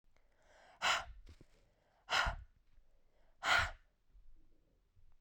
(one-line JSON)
{"exhalation_length": "5.2 s", "exhalation_amplitude": 3672, "exhalation_signal_mean_std_ratio": 0.35, "survey_phase": "beta (2021-08-13 to 2022-03-07)", "age": "45-64", "gender": "Female", "wearing_mask": "No", "symptom_fatigue": true, "symptom_headache": true, "smoker_status": "Never smoked", "respiratory_condition_asthma": false, "respiratory_condition_other": false, "recruitment_source": "Test and Trace", "submission_delay": "1 day", "covid_test_result": "Positive", "covid_test_method": "RT-qPCR"}